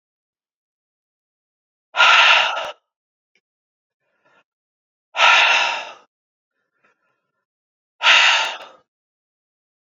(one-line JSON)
{"exhalation_length": "9.9 s", "exhalation_amplitude": 32767, "exhalation_signal_mean_std_ratio": 0.34, "survey_phase": "beta (2021-08-13 to 2022-03-07)", "age": "18-44", "gender": "Male", "wearing_mask": "No", "symptom_fatigue": true, "symptom_fever_high_temperature": true, "symptom_headache": true, "symptom_change_to_sense_of_smell_or_taste": true, "symptom_loss_of_taste": true, "symptom_onset": "3 days", "smoker_status": "Never smoked", "respiratory_condition_asthma": false, "respiratory_condition_other": false, "recruitment_source": "Test and Trace", "submission_delay": "1 day", "covid_test_result": "Positive", "covid_test_method": "RT-qPCR", "covid_ct_value": 18.8, "covid_ct_gene": "ORF1ab gene", "covid_ct_mean": 19.4, "covid_viral_load": "430000 copies/ml", "covid_viral_load_category": "Low viral load (10K-1M copies/ml)"}